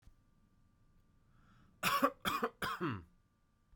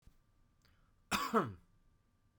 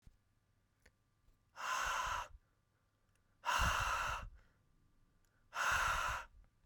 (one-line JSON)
{"three_cough_length": "3.8 s", "three_cough_amplitude": 4653, "three_cough_signal_mean_std_ratio": 0.39, "cough_length": "2.4 s", "cough_amplitude": 3450, "cough_signal_mean_std_ratio": 0.31, "exhalation_length": "6.7 s", "exhalation_amplitude": 2488, "exhalation_signal_mean_std_ratio": 0.5, "survey_phase": "beta (2021-08-13 to 2022-03-07)", "age": "18-44", "gender": "Male", "wearing_mask": "No", "symptom_none": true, "smoker_status": "Never smoked", "respiratory_condition_asthma": false, "respiratory_condition_other": false, "recruitment_source": "REACT", "submission_delay": "2 days", "covid_test_result": "Negative", "covid_test_method": "RT-qPCR", "influenza_a_test_result": "Negative", "influenza_b_test_result": "Negative"}